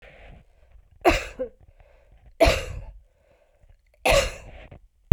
{
  "three_cough_length": "5.1 s",
  "three_cough_amplitude": 32195,
  "three_cough_signal_mean_std_ratio": 0.32,
  "survey_phase": "beta (2021-08-13 to 2022-03-07)",
  "age": "45-64",
  "gender": "Female",
  "wearing_mask": "No",
  "symptom_fatigue": true,
  "symptom_headache": true,
  "symptom_onset": "9 days",
  "smoker_status": "Never smoked",
  "respiratory_condition_asthma": false,
  "respiratory_condition_other": false,
  "recruitment_source": "REACT",
  "submission_delay": "3 days",
  "covid_test_result": "Positive",
  "covid_test_method": "RT-qPCR",
  "covid_ct_value": 27.0,
  "covid_ct_gene": "E gene",
  "influenza_a_test_result": "Negative",
  "influenza_b_test_result": "Negative"
}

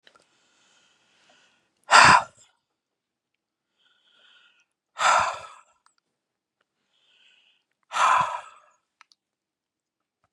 {
  "exhalation_length": "10.3 s",
  "exhalation_amplitude": 29739,
  "exhalation_signal_mean_std_ratio": 0.24,
  "survey_phase": "beta (2021-08-13 to 2022-03-07)",
  "age": "65+",
  "gender": "Male",
  "wearing_mask": "No",
  "symptom_none": true,
  "smoker_status": "Ex-smoker",
  "respiratory_condition_asthma": false,
  "respiratory_condition_other": false,
  "recruitment_source": "REACT",
  "submission_delay": "4 days",
  "covid_test_result": "Negative",
  "covid_test_method": "RT-qPCR",
  "influenza_a_test_result": "Negative",
  "influenza_b_test_result": "Negative"
}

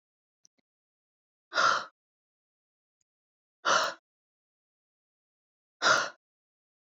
{
  "exhalation_length": "7.0 s",
  "exhalation_amplitude": 9306,
  "exhalation_signal_mean_std_ratio": 0.26,
  "survey_phase": "alpha (2021-03-01 to 2021-08-12)",
  "age": "18-44",
  "gender": "Female",
  "wearing_mask": "No",
  "symptom_none": true,
  "smoker_status": "Never smoked",
  "respiratory_condition_asthma": true,
  "respiratory_condition_other": false,
  "recruitment_source": "REACT",
  "submission_delay": "2 days",
  "covid_test_result": "Negative",
  "covid_test_method": "RT-qPCR"
}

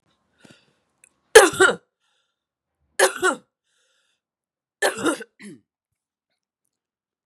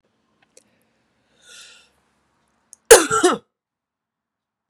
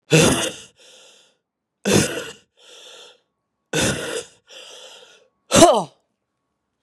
{
  "three_cough_length": "7.3 s",
  "three_cough_amplitude": 32768,
  "three_cough_signal_mean_std_ratio": 0.23,
  "cough_length": "4.7 s",
  "cough_amplitude": 32768,
  "cough_signal_mean_std_ratio": 0.2,
  "exhalation_length": "6.8 s",
  "exhalation_amplitude": 32767,
  "exhalation_signal_mean_std_ratio": 0.35,
  "survey_phase": "beta (2021-08-13 to 2022-03-07)",
  "age": "45-64",
  "gender": "Female",
  "wearing_mask": "No",
  "symptom_cough_any": true,
  "symptom_runny_or_blocked_nose": true,
  "symptom_sore_throat": true,
  "symptom_headache": true,
  "smoker_status": "Ex-smoker",
  "respiratory_condition_asthma": false,
  "respiratory_condition_other": false,
  "recruitment_source": "Test and Trace",
  "submission_delay": "1 day",
  "covid_test_result": "Positive",
  "covid_test_method": "LFT"
}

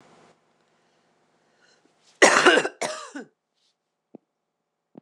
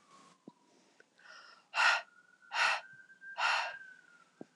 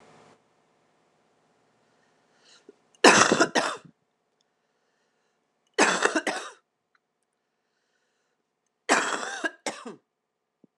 {
  "cough_length": "5.0 s",
  "cough_amplitude": 26027,
  "cough_signal_mean_std_ratio": 0.25,
  "exhalation_length": "4.6 s",
  "exhalation_amplitude": 5751,
  "exhalation_signal_mean_std_ratio": 0.39,
  "three_cough_length": "10.8 s",
  "three_cough_amplitude": 26028,
  "three_cough_signal_mean_std_ratio": 0.27,
  "survey_phase": "beta (2021-08-13 to 2022-03-07)",
  "age": "45-64",
  "gender": "Female",
  "wearing_mask": "No",
  "symptom_cough_any": true,
  "symptom_new_continuous_cough": true,
  "symptom_runny_or_blocked_nose": true,
  "symptom_fever_high_temperature": true,
  "symptom_onset": "4 days",
  "smoker_status": "Never smoked",
  "respiratory_condition_asthma": false,
  "respiratory_condition_other": false,
  "recruitment_source": "Test and Trace",
  "submission_delay": "2 days",
  "covid_test_result": "Positive",
  "covid_test_method": "RT-qPCR",
  "covid_ct_value": 15.0,
  "covid_ct_gene": "ORF1ab gene",
  "covid_ct_mean": 15.1,
  "covid_viral_load": "11000000 copies/ml",
  "covid_viral_load_category": "High viral load (>1M copies/ml)"
}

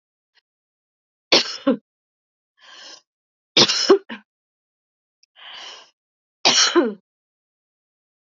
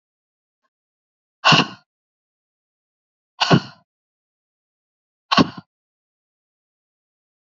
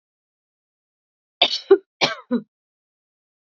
{
  "three_cough_length": "8.4 s",
  "three_cough_amplitude": 32201,
  "three_cough_signal_mean_std_ratio": 0.29,
  "exhalation_length": "7.5 s",
  "exhalation_amplitude": 32203,
  "exhalation_signal_mean_std_ratio": 0.2,
  "cough_length": "3.4 s",
  "cough_amplitude": 27606,
  "cough_signal_mean_std_ratio": 0.24,
  "survey_phase": "beta (2021-08-13 to 2022-03-07)",
  "age": "18-44",
  "gender": "Female",
  "wearing_mask": "No",
  "symptom_cough_any": true,
  "symptom_runny_or_blocked_nose": true,
  "symptom_onset": "7 days",
  "smoker_status": "Never smoked",
  "respiratory_condition_asthma": false,
  "respiratory_condition_other": false,
  "recruitment_source": "REACT",
  "submission_delay": "1 day",
  "covid_test_result": "Negative",
  "covid_test_method": "RT-qPCR",
  "influenza_a_test_result": "Negative",
  "influenza_b_test_result": "Negative"
}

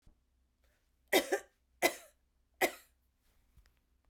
{
  "three_cough_length": "4.1 s",
  "three_cough_amplitude": 7856,
  "three_cough_signal_mean_std_ratio": 0.24,
  "survey_phase": "beta (2021-08-13 to 2022-03-07)",
  "age": "45-64",
  "gender": "Female",
  "wearing_mask": "No",
  "symptom_none": true,
  "smoker_status": "Never smoked",
  "respiratory_condition_asthma": false,
  "respiratory_condition_other": false,
  "recruitment_source": "REACT",
  "submission_delay": "2 days",
  "covid_test_result": "Negative",
  "covid_test_method": "RT-qPCR",
  "influenza_a_test_result": "Negative",
  "influenza_b_test_result": "Negative"
}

